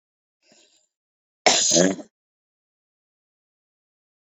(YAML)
cough_length: 4.3 s
cough_amplitude: 27481
cough_signal_mean_std_ratio: 0.26
survey_phase: beta (2021-08-13 to 2022-03-07)
age: 18-44
gender: Female
wearing_mask: 'No'
symptom_cough_any: true
symptom_new_continuous_cough: true
symptom_fatigue: true
symptom_fever_high_temperature: true
symptom_headache: true
symptom_change_to_sense_of_smell_or_taste: true
symptom_loss_of_taste: true
smoker_status: Never smoked
respiratory_condition_asthma: true
respiratory_condition_other: false
recruitment_source: Test and Trace
submission_delay: 2 days
covid_test_result: Negative
covid_test_method: LAMP